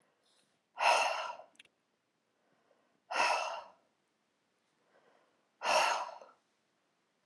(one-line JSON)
{"exhalation_length": "7.3 s", "exhalation_amplitude": 5294, "exhalation_signal_mean_std_ratio": 0.36, "survey_phase": "alpha (2021-03-01 to 2021-08-12)", "age": "45-64", "gender": "Female", "wearing_mask": "No", "symptom_none": true, "smoker_status": "Ex-smoker", "respiratory_condition_asthma": false, "respiratory_condition_other": false, "recruitment_source": "REACT", "submission_delay": "1 day", "covid_test_result": "Negative", "covid_test_method": "RT-qPCR"}